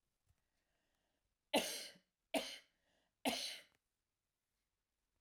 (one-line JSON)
{"three_cough_length": "5.2 s", "three_cough_amplitude": 2839, "three_cough_signal_mean_std_ratio": 0.28, "survey_phase": "alpha (2021-03-01 to 2021-08-12)", "age": "65+", "gender": "Female", "wearing_mask": "No", "symptom_none": true, "smoker_status": "Ex-smoker", "respiratory_condition_asthma": false, "respiratory_condition_other": false, "recruitment_source": "REACT", "submission_delay": "3 days", "covid_test_result": "Negative", "covid_test_method": "RT-qPCR"}